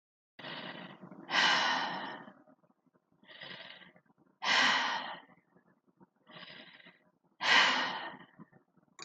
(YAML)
exhalation_length: 9.0 s
exhalation_amplitude: 9125
exhalation_signal_mean_std_ratio: 0.42
survey_phase: beta (2021-08-13 to 2022-03-07)
age: 65+
gender: Female
wearing_mask: 'No'
symptom_none: true
smoker_status: Never smoked
respiratory_condition_asthma: false
respiratory_condition_other: false
recruitment_source: REACT
submission_delay: 3 days
covid_test_result: Negative
covid_test_method: RT-qPCR
influenza_a_test_result: Negative
influenza_b_test_result: Negative